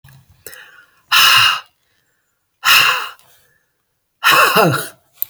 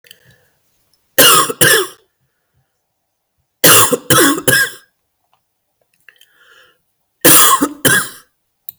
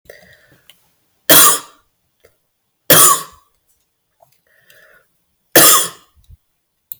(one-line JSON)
{"exhalation_length": "5.3 s", "exhalation_amplitude": 32768, "exhalation_signal_mean_std_ratio": 0.45, "cough_length": "8.8 s", "cough_amplitude": 32768, "cough_signal_mean_std_ratio": 0.41, "three_cough_length": "7.0 s", "three_cough_amplitude": 32768, "three_cough_signal_mean_std_ratio": 0.3, "survey_phase": "beta (2021-08-13 to 2022-03-07)", "age": "45-64", "gender": "Female", "wearing_mask": "No", "symptom_cough_any": true, "symptom_change_to_sense_of_smell_or_taste": true, "symptom_onset": "7 days", "smoker_status": "Never smoked", "respiratory_condition_asthma": false, "respiratory_condition_other": false, "recruitment_source": "Test and Trace", "submission_delay": "2 days", "covid_test_result": "Positive", "covid_test_method": "RT-qPCR", "covid_ct_value": 20.0, "covid_ct_gene": "ORF1ab gene", "covid_ct_mean": 20.5, "covid_viral_load": "190000 copies/ml", "covid_viral_load_category": "Low viral load (10K-1M copies/ml)"}